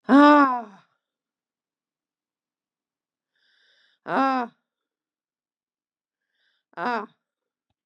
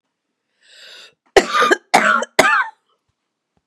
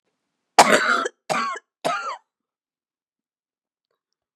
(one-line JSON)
{"exhalation_length": "7.9 s", "exhalation_amplitude": 24823, "exhalation_signal_mean_std_ratio": 0.24, "cough_length": "3.7 s", "cough_amplitude": 32768, "cough_signal_mean_std_ratio": 0.39, "three_cough_length": "4.4 s", "three_cough_amplitude": 32768, "three_cough_signal_mean_std_ratio": 0.32, "survey_phase": "beta (2021-08-13 to 2022-03-07)", "age": "65+", "gender": "Female", "wearing_mask": "No", "symptom_cough_any": true, "symptom_runny_or_blocked_nose": true, "symptom_sore_throat": true, "symptom_abdominal_pain": true, "symptom_fatigue": true, "symptom_change_to_sense_of_smell_or_taste": true, "smoker_status": "Never smoked", "respiratory_condition_asthma": true, "respiratory_condition_other": false, "recruitment_source": "Test and Trace", "submission_delay": "1 day", "covid_test_result": "Positive", "covid_test_method": "LFT"}